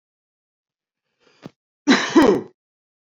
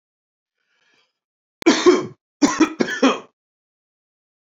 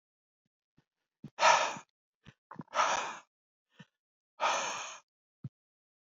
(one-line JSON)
{"cough_length": "3.2 s", "cough_amplitude": 28494, "cough_signal_mean_std_ratio": 0.3, "three_cough_length": "4.5 s", "three_cough_amplitude": 30771, "three_cough_signal_mean_std_ratio": 0.32, "exhalation_length": "6.1 s", "exhalation_amplitude": 9503, "exhalation_signal_mean_std_ratio": 0.33, "survey_phase": "beta (2021-08-13 to 2022-03-07)", "age": "18-44", "gender": "Male", "wearing_mask": "No", "symptom_none": true, "symptom_onset": "5 days", "smoker_status": "Ex-smoker", "respiratory_condition_asthma": false, "respiratory_condition_other": false, "recruitment_source": "REACT", "submission_delay": "2 days", "covid_test_result": "Negative", "covid_test_method": "RT-qPCR", "influenza_a_test_result": "Unknown/Void", "influenza_b_test_result": "Unknown/Void"}